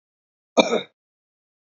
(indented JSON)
{
  "cough_length": "1.7 s",
  "cough_amplitude": 29397,
  "cough_signal_mean_std_ratio": 0.24,
  "survey_phase": "beta (2021-08-13 to 2022-03-07)",
  "age": "18-44",
  "gender": "Male",
  "wearing_mask": "No",
  "symptom_headache": true,
  "smoker_status": "Current smoker (11 or more cigarettes per day)",
  "respiratory_condition_asthma": false,
  "respiratory_condition_other": false,
  "recruitment_source": "REACT",
  "submission_delay": "1 day",
  "covid_test_result": "Negative",
  "covid_test_method": "RT-qPCR",
  "influenza_a_test_result": "Negative",
  "influenza_b_test_result": "Negative"
}